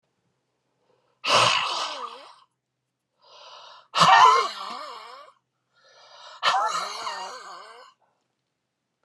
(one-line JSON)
{"exhalation_length": "9.0 s", "exhalation_amplitude": 23766, "exhalation_signal_mean_std_ratio": 0.37, "survey_phase": "beta (2021-08-13 to 2022-03-07)", "age": "65+", "gender": "Male", "wearing_mask": "No", "symptom_runny_or_blocked_nose": true, "symptom_diarrhoea": true, "symptom_fatigue": true, "symptom_onset": "12 days", "smoker_status": "Never smoked", "respiratory_condition_asthma": false, "respiratory_condition_other": false, "recruitment_source": "REACT", "submission_delay": "2 days", "covid_test_result": "Negative", "covid_test_method": "RT-qPCR"}